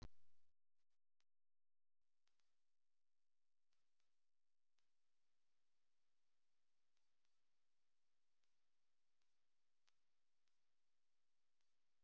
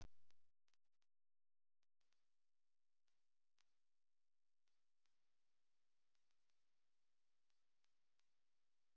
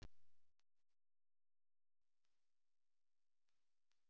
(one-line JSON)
{"exhalation_length": "12.0 s", "exhalation_amplitude": 136, "exhalation_signal_mean_std_ratio": 0.78, "three_cough_length": "9.0 s", "three_cough_amplitude": 126, "three_cough_signal_mean_std_ratio": 0.75, "cough_length": "4.1 s", "cough_amplitude": 180, "cough_signal_mean_std_ratio": 0.69, "survey_phase": "beta (2021-08-13 to 2022-03-07)", "age": "45-64", "gender": "Female", "wearing_mask": "No", "symptom_shortness_of_breath": true, "symptom_fatigue": true, "smoker_status": "Never smoked", "respiratory_condition_asthma": false, "respiratory_condition_other": false, "recruitment_source": "REACT", "submission_delay": "14 days", "covid_test_result": "Negative", "covid_test_method": "RT-qPCR"}